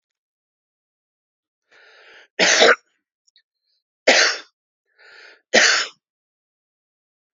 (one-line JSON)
{"three_cough_length": "7.3 s", "three_cough_amplitude": 32767, "three_cough_signal_mean_std_ratio": 0.29, "survey_phase": "alpha (2021-03-01 to 2021-08-12)", "age": "45-64", "gender": "Male", "wearing_mask": "No", "symptom_none": true, "smoker_status": "Current smoker (11 or more cigarettes per day)", "respiratory_condition_asthma": false, "respiratory_condition_other": false, "recruitment_source": "REACT", "submission_delay": "1 day", "covid_test_result": "Negative", "covid_test_method": "RT-qPCR"}